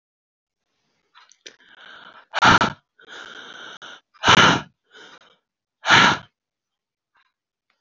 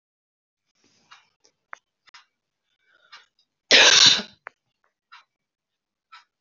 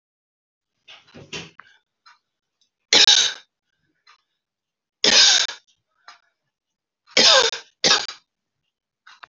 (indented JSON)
{
  "exhalation_length": "7.8 s",
  "exhalation_amplitude": 29025,
  "exhalation_signal_mean_std_ratio": 0.29,
  "cough_length": "6.4 s",
  "cough_amplitude": 30254,
  "cough_signal_mean_std_ratio": 0.22,
  "three_cough_length": "9.3 s",
  "three_cough_amplitude": 32701,
  "three_cough_signal_mean_std_ratio": 0.3,
  "survey_phase": "beta (2021-08-13 to 2022-03-07)",
  "age": "45-64",
  "gender": "Female",
  "wearing_mask": "No",
  "symptom_cough_any": true,
  "symptom_runny_or_blocked_nose": true,
  "symptom_sore_throat": true,
  "symptom_onset": "2 days",
  "smoker_status": "Ex-smoker",
  "respiratory_condition_asthma": false,
  "respiratory_condition_other": false,
  "recruitment_source": "Test and Trace",
  "submission_delay": "2 days",
  "covid_test_result": "Positive",
  "covid_test_method": "ePCR"
}